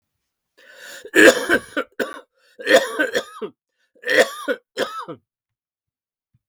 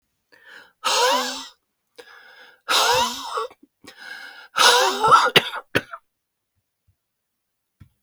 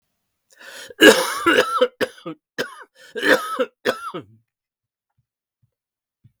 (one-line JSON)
{"three_cough_length": "6.5 s", "three_cough_amplitude": 32766, "three_cough_signal_mean_std_ratio": 0.35, "exhalation_length": "8.0 s", "exhalation_amplitude": 32045, "exhalation_signal_mean_std_ratio": 0.41, "cough_length": "6.4 s", "cough_amplitude": 32768, "cough_signal_mean_std_ratio": 0.34, "survey_phase": "beta (2021-08-13 to 2022-03-07)", "age": "45-64", "gender": "Male", "wearing_mask": "No", "symptom_cough_any": true, "symptom_new_continuous_cough": true, "symptom_runny_or_blocked_nose": true, "symptom_shortness_of_breath": true, "symptom_sore_throat": true, "symptom_diarrhoea": true, "symptom_fatigue": true, "symptom_fever_high_temperature": true, "symptom_headache": true, "symptom_onset": "6 days", "smoker_status": "Never smoked", "respiratory_condition_asthma": false, "respiratory_condition_other": false, "recruitment_source": "Test and Trace", "submission_delay": "4 days", "covid_test_result": "Negative", "covid_test_method": "RT-qPCR"}